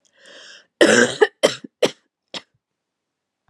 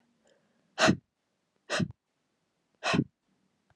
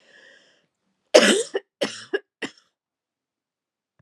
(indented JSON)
{
  "cough_length": "3.5 s",
  "cough_amplitude": 32151,
  "cough_signal_mean_std_ratio": 0.3,
  "exhalation_length": "3.8 s",
  "exhalation_amplitude": 11416,
  "exhalation_signal_mean_std_ratio": 0.28,
  "three_cough_length": "4.0 s",
  "three_cough_amplitude": 32767,
  "three_cough_signal_mean_std_ratio": 0.25,
  "survey_phase": "beta (2021-08-13 to 2022-03-07)",
  "age": "18-44",
  "gender": "Female",
  "wearing_mask": "No",
  "symptom_cough_any": true,
  "symptom_new_continuous_cough": true,
  "symptom_runny_or_blocked_nose": true,
  "symptom_shortness_of_breath": true,
  "symptom_sore_throat": true,
  "symptom_fatigue": true,
  "symptom_headache": true,
  "symptom_change_to_sense_of_smell_or_taste": true,
  "symptom_loss_of_taste": true,
  "symptom_onset": "7 days",
  "smoker_status": "Never smoked",
  "respiratory_condition_asthma": true,
  "respiratory_condition_other": false,
  "recruitment_source": "Test and Trace",
  "submission_delay": "2 days",
  "covid_test_result": "Positive",
  "covid_test_method": "RT-qPCR",
  "covid_ct_value": 14.5,
  "covid_ct_gene": "ORF1ab gene",
  "covid_ct_mean": 15.0,
  "covid_viral_load": "12000000 copies/ml",
  "covid_viral_load_category": "High viral load (>1M copies/ml)"
}